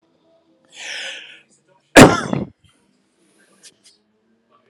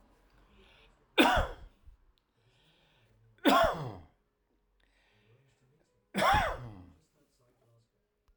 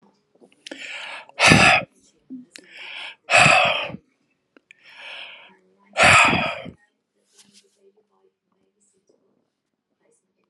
{"cough_length": "4.7 s", "cough_amplitude": 32768, "cough_signal_mean_std_ratio": 0.21, "three_cough_length": "8.4 s", "three_cough_amplitude": 10515, "three_cough_signal_mean_std_ratio": 0.31, "exhalation_length": "10.5 s", "exhalation_amplitude": 32768, "exhalation_signal_mean_std_ratio": 0.33, "survey_phase": "alpha (2021-03-01 to 2021-08-12)", "age": "65+", "gender": "Male", "wearing_mask": "No", "symptom_none": true, "smoker_status": "Current smoker (1 to 10 cigarettes per day)", "respiratory_condition_asthma": false, "respiratory_condition_other": false, "recruitment_source": "REACT", "submission_delay": "3 days", "covid_test_result": "Negative", "covid_test_method": "RT-qPCR"}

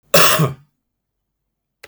{"cough_length": "1.9 s", "cough_amplitude": 32768, "cough_signal_mean_std_ratio": 0.36, "survey_phase": "beta (2021-08-13 to 2022-03-07)", "age": "45-64", "gender": "Male", "wearing_mask": "No", "symptom_cough_any": true, "symptom_sore_throat": true, "smoker_status": "Ex-smoker", "respiratory_condition_asthma": false, "respiratory_condition_other": false, "recruitment_source": "REACT", "submission_delay": "14 days", "covid_test_result": "Negative", "covid_test_method": "RT-qPCR"}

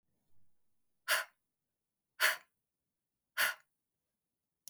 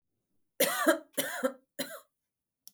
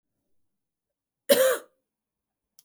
{"exhalation_length": "4.7 s", "exhalation_amplitude": 5822, "exhalation_signal_mean_std_ratio": 0.25, "three_cough_length": "2.7 s", "three_cough_amplitude": 10189, "three_cough_signal_mean_std_ratio": 0.39, "cough_length": "2.6 s", "cough_amplitude": 19146, "cough_signal_mean_std_ratio": 0.26, "survey_phase": "beta (2021-08-13 to 2022-03-07)", "age": "18-44", "gender": "Female", "wearing_mask": "No", "symptom_none": true, "symptom_onset": "12 days", "smoker_status": "Never smoked", "respiratory_condition_asthma": false, "respiratory_condition_other": false, "recruitment_source": "REACT", "submission_delay": "3 days", "covid_test_result": "Negative", "covid_test_method": "RT-qPCR", "influenza_a_test_result": "Negative", "influenza_b_test_result": "Negative"}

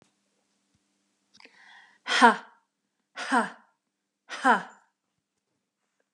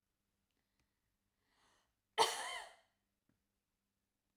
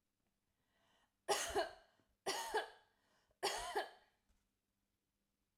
{"exhalation_length": "6.1 s", "exhalation_amplitude": 27163, "exhalation_signal_mean_std_ratio": 0.24, "cough_length": "4.4 s", "cough_amplitude": 4040, "cough_signal_mean_std_ratio": 0.21, "three_cough_length": "5.6 s", "three_cough_amplitude": 2270, "three_cough_signal_mean_std_ratio": 0.37, "survey_phase": "alpha (2021-03-01 to 2021-08-12)", "age": "45-64", "gender": "Female", "wearing_mask": "No", "symptom_none": true, "smoker_status": "Ex-smoker", "respiratory_condition_asthma": false, "respiratory_condition_other": false, "recruitment_source": "REACT", "submission_delay": "2 days", "covid_test_result": "Negative", "covid_test_method": "RT-qPCR"}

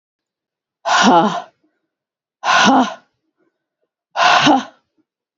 {"exhalation_length": "5.4 s", "exhalation_amplitude": 32514, "exhalation_signal_mean_std_ratio": 0.43, "survey_phase": "beta (2021-08-13 to 2022-03-07)", "age": "45-64", "gender": "Female", "wearing_mask": "No", "symptom_new_continuous_cough": true, "symptom_shortness_of_breath": true, "symptom_onset": "3 days", "smoker_status": "Never smoked", "respiratory_condition_asthma": true, "respiratory_condition_other": false, "recruitment_source": "Test and Trace", "submission_delay": "2 days", "covid_test_result": "Positive", "covid_test_method": "ePCR"}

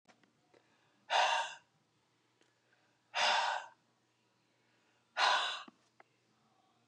{"exhalation_length": "6.9 s", "exhalation_amplitude": 4602, "exhalation_signal_mean_std_ratio": 0.36, "survey_phase": "beta (2021-08-13 to 2022-03-07)", "age": "45-64", "gender": "Female", "wearing_mask": "No", "symptom_cough_any": true, "symptom_runny_or_blocked_nose": true, "symptom_sore_throat": true, "symptom_fatigue": true, "symptom_headache": true, "symptom_onset": "3 days", "smoker_status": "Ex-smoker", "respiratory_condition_asthma": false, "respiratory_condition_other": false, "recruitment_source": "Test and Trace", "submission_delay": "1 day", "covid_test_result": "Positive", "covid_test_method": "RT-qPCR", "covid_ct_value": 13.9, "covid_ct_gene": "ORF1ab gene"}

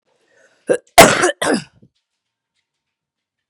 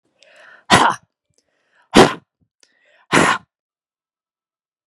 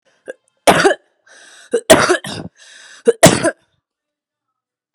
{"cough_length": "3.5 s", "cough_amplitude": 32768, "cough_signal_mean_std_ratio": 0.28, "exhalation_length": "4.9 s", "exhalation_amplitude": 32768, "exhalation_signal_mean_std_ratio": 0.27, "three_cough_length": "4.9 s", "three_cough_amplitude": 32768, "three_cough_signal_mean_std_ratio": 0.34, "survey_phase": "beta (2021-08-13 to 2022-03-07)", "age": "45-64", "gender": "Female", "wearing_mask": "No", "symptom_cough_any": true, "symptom_sore_throat": true, "symptom_onset": "2 days", "smoker_status": "Ex-smoker", "respiratory_condition_asthma": false, "respiratory_condition_other": false, "recruitment_source": "Test and Trace", "submission_delay": "1 day", "covid_test_result": "Negative", "covid_test_method": "ePCR"}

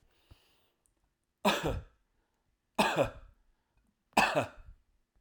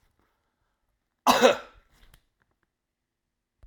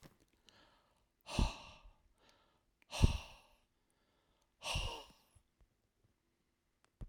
{"three_cough_length": "5.2 s", "three_cough_amplitude": 9946, "three_cough_signal_mean_std_ratio": 0.33, "cough_length": "3.7 s", "cough_amplitude": 17567, "cough_signal_mean_std_ratio": 0.22, "exhalation_length": "7.1 s", "exhalation_amplitude": 6297, "exhalation_signal_mean_std_ratio": 0.25, "survey_phase": "alpha (2021-03-01 to 2021-08-12)", "age": "45-64", "gender": "Male", "wearing_mask": "No", "symptom_none": true, "smoker_status": "Never smoked", "respiratory_condition_asthma": false, "respiratory_condition_other": false, "recruitment_source": "REACT", "submission_delay": "2 days", "covid_test_result": "Negative", "covid_test_method": "RT-qPCR"}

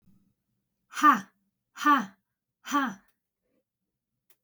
{"exhalation_length": "4.4 s", "exhalation_amplitude": 13090, "exhalation_signal_mean_std_ratio": 0.28, "survey_phase": "beta (2021-08-13 to 2022-03-07)", "age": "18-44", "gender": "Female", "wearing_mask": "No", "symptom_cough_any": true, "symptom_runny_or_blocked_nose": true, "symptom_sore_throat": true, "symptom_fever_high_temperature": true, "symptom_headache": true, "smoker_status": "Ex-smoker", "respiratory_condition_asthma": false, "respiratory_condition_other": false, "recruitment_source": "Test and Trace", "submission_delay": "2 days", "covid_test_result": "Positive", "covid_test_method": "RT-qPCR", "covid_ct_value": 21.6, "covid_ct_gene": "ORF1ab gene", "covid_ct_mean": 22.0, "covid_viral_load": "63000 copies/ml", "covid_viral_load_category": "Low viral load (10K-1M copies/ml)"}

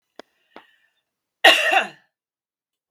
{"cough_length": "2.9 s", "cough_amplitude": 32768, "cough_signal_mean_std_ratio": 0.27, "survey_phase": "beta (2021-08-13 to 2022-03-07)", "age": "18-44", "gender": "Female", "wearing_mask": "No", "symptom_none": true, "smoker_status": "Never smoked", "respiratory_condition_asthma": false, "respiratory_condition_other": false, "recruitment_source": "REACT", "submission_delay": "1 day", "covid_test_result": "Negative", "covid_test_method": "RT-qPCR", "influenza_a_test_result": "Negative", "influenza_b_test_result": "Negative"}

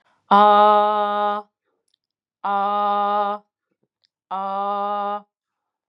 {"exhalation_length": "5.9 s", "exhalation_amplitude": 24862, "exhalation_signal_mean_std_ratio": 0.52, "survey_phase": "beta (2021-08-13 to 2022-03-07)", "age": "45-64", "gender": "Female", "wearing_mask": "Yes", "symptom_cough_any": true, "symptom_shortness_of_breath": true, "symptom_sore_throat": true, "symptom_abdominal_pain": true, "symptom_fatigue": true, "smoker_status": "Never smoked", "respiratory_condition_asthma": true, "respiratory_condition_other": false, "recruitment_source": "Test and Trace", "submission_delay": "1 day", "covid_test_result": "Positive", "covid_test_method": "RT-qPCR", "covid_ct_value": 22.7, "covid_ct_gene": "ORF1ab gene", "covid_ct_mean": 22.9, "covid_viral_load": "30000 copies/ml", "covid_viral_load_category": "Low viral load (10K-1M copies/ml)"}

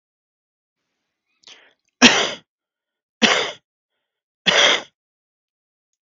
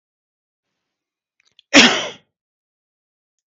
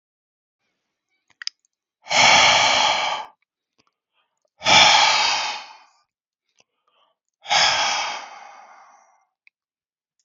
{"three_cough_length": "6.1 s", "three_cough_amplitude": 32768, "three_cough_signal_mean_std_ratio": 0.28, "cough_length": "3.5 s", "cough_amplitude": 32768, "cough_signal_mean_std_ratio": 0.21, "exhalation_length": "10.2 s", "exhalation_amplitude": 32109, "exhalation_signal_mean_std_ratio": 0.41, "survey_phase": "beta (2021-08-13 to 2022-03-07)", "age": "45-64", "gender": "Male", "wearing_mask": "No", "symptom_cough_any": true, "symptom_runny_or_blocked_nose": true, "symptom_onset": "5 days", "smoker_status": "Ex-smoker", "respiratory_condition_asthma": false, "respiratory_condition_other": false, "recruitment_source": "REACT", "submission_delay": "1 day", "covid_test_result": "Negative", "covid_test_method": "RT-qPCR"}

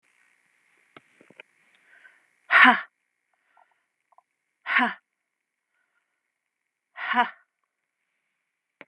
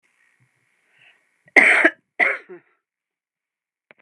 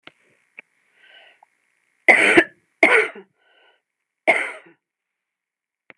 {"exhalation_length": "8.9 s", "exhalation_amplitude": 29177, "exhalation_signal_mean_std_ratio": 0.21, "cough_length": "4.0 s", "cough_amplitude": 32768, "cough_signal_mean_std_ratio": 0.27, "three_cough_length": "6.0 s", "three_cough_amplitude": 32768, "three_cough_signal_mean_std_ratio": 0.28, "survey_phase": "beta (2021-08-13 to 2022-03-07)", "age": "45-64", "gender": "Female", "wearing_mask": "No", "symptom_cough_any": true, "symptom_runny_or_blocked_nose": true, "symptom_sore_throat": true, "symptom_fever_high_temperature": true, "symptom_headache": true, "symptom_onset": "3 days", "smoker_status": "Ex-smoker", "respiratory_condition_asthma": false, "respiratory_condition_other": false, "recruitment_source": "Test and Trace", "submission_delay": "1 day", "covid_test_result": "Positive", "covid_test_method": "RT-qPCR", "covid_ct_value": 18.2, "covid_ct_gene": "ORF1ab gene", "covid_ct_mean": 18.3, "covid_viral_load": "1000000 copies/ml", "covid_viral_load_category": "High viral load (>1M copies/ml)"}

